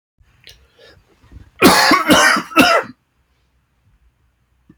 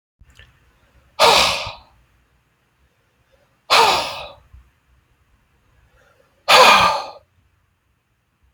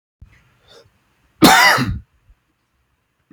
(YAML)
three_cough_length: 4.8 s
three_cough_amplitude: 32768
three_cough_signal_mean_std_ratio: 0.4
exhalation_length: 8.5 s
exhalation_amplitude: 31641
exhalation_signal_mean_std_ratio: 0.32
cough_length: 3.3 s
cough_amplitude: 32768
cough_signal_mean_std_ratio: 0.32
survey_phase: beta (2021-08-13 to 2022-03-07)
age: 45-64
gender: Male
wearing_mask: 'No'
symptom_cough_any: true
symptom_runny_or_blocked_nose: true
symptom_shortness_of_breath: true
symptom_sore_throat: true
symptom_diarrhoea: true
symptom_fatigue: true
symptom_fever_high_temperature: true
symptom_headache: true
symptom_change_to_sense_of_smell_or_taste: true
symptom_loss_of_taste: true
symptom_other: true
smoker_status: Ex-smoker
respiratory_condition_asthma: false
respiratory_condition_other: false
recruitment_source: Test and Trace
submission_delay: 2 days
covid_test_result: Positive
covid_test_method: RT-qPCR
covid_ct_value: 12.7
covid_ct_gene: ORF1ab gene
covid_ct_mean: 13.3
covid_viral_load: 44000000 copies/ml
covid_viral_load_category: High viral load (>1M copies/ml)